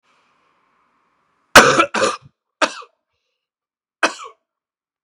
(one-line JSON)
{"three_cough_length": "5.0 s", "three_cough_amplitude": 32768, "three_cough_signal_mean_std_ratio": 0.25, "survey_phase": "beta (2021-08-13 to 2022-03-07)", "age": "18-44", "gender": "Male", "wearing_mask": "No", "symptom_cough_any": true, "symptom_new_continuous_cough": true, "symptom_runny_or_blocked_nose": true, "symptom_sore_throat": true, "symptom_abdominal_pain": true, "symptom_diarrhoea": true, "symptom_fatigue": true, "symptom_headache": true, "symptom_onset": "6 days", "smoker_status": "Ex-smoker", "respiratory_condition_asthma": false, "respiratory_condition_other": false, "recruitment_source": "Test and Trace", "submission_delay": "1 day", "covid_test_result": "Positive", "covid_test_method": "RT-qPCR", "covid_ct_value": 20.2, "covid_ct_gene": "ORF1ab gene", "covid_ct_mean": 20.8, "covid_viral_load": "160000 copies/ml", "covid_viral_load_category": "Low viral load (10K-1M copies/ml)"}